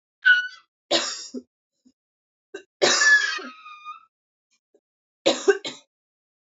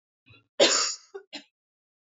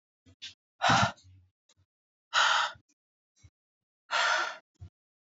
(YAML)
three_cough_length: 6.5 s
three_cough_amplitude: 21967
three_cough_signal_mean_std_ratio: 0.36
cough_length: 2.0 s
cough_amplitude: 15092
cough_signal_mean_std_ratio: 0.33
exhalation_length: 5.3 s
exhalation_amplitude: 8217
exhalation_signal_mean_std_ratio: 0.37
survey_phase: beta (2021-08-13 to 2022-03-07)
age: 18-44
gender: Female
wearing_mask: 'No'
symptom_cough_any: true
symptom_shortness_of_breath: true
symptom_sore_throat: true
symptom_fatigue: true
symptom_change_to_sense_of_smell_or_taste: true
smoker_status: Never smoked
respiratory_condition_asthma: false
respiratory_condition_other: false
recruitment_source: Test and Trace
submission_delay: 2 days
covid_test_result: Negative
covid_test_method: RT-qPCR